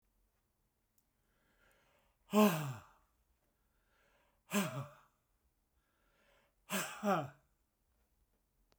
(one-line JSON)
{"exhalation_length": "8.8 s", "exhalation_amplitude": 5627, "exhalation_signal_mean_std_ratio": 0.26, "survey_phase": "beta (2021-08-13 to 2022-03-07)", "age": "65+", "gender": "Male", "wearing_mask": "No", "symptom_none": true, "smoker_status": "Ex-smoker", "respiratory_condition_asthma": false, "respiratory_condition_other": false, "recruitment_source": "REACT", "submission_delay": "8 days", "covid_test_result": "Negative", "covid_test_method": "RT-qPCR"}